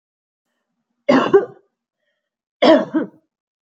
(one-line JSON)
{"cough_length": "3.7 s", "cough_amplitude": 27500, "cough_signal_mean_std_ratio": 0.33, "survey_phase": "beta (2021-08-13 to 2022-03-07)", "age": "18-44", "gender": "Female", "wearing_mask": "No", "symptom_none": true, "smoker_status": "Ex-smoker", "respiratory_condition_asthma": false, "respiratory_condition_other": false, "recruitment_source": "REACT", "submission_delay": "1 day", "covid_test_result": "Negative", "covid_test_method": "RT-qPCR", "influenza_a_test_result": "Negative", "influenza_b_test_result": "Negative"}